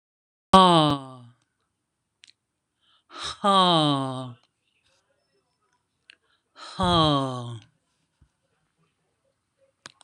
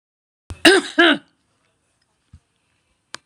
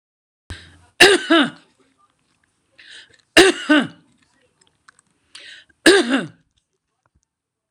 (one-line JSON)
{"exhalation_length": "10.0 s", "exhalation_amplitude": 26027, "exhalation_signal_mean_std_ratio": 0.32, "cough_length": "3.3 s", "cough_amplitude": 26028, "cough_signal_mean_std_ratio": 0.27, "three_cough_length": "7.7 s", "three_cough_amplitude": 26028, "three_cough_signal_mean_std_ratio": 0.3, "survey_phase": "beta (2021-08-13 to 2022-03-07)", "age": "65+", "gender": "Female", "wearing_mask": "No", "symptom_none": true, "smoker_status": "Ex-smoker", "respiratory_condition_asthma": true, "respiratory_condition_other": false, "recruitment_source": "REACT", "submission_delay": "1 day", "covid_test_result": "Negative", "covid_test_method": "RT-qPCR"}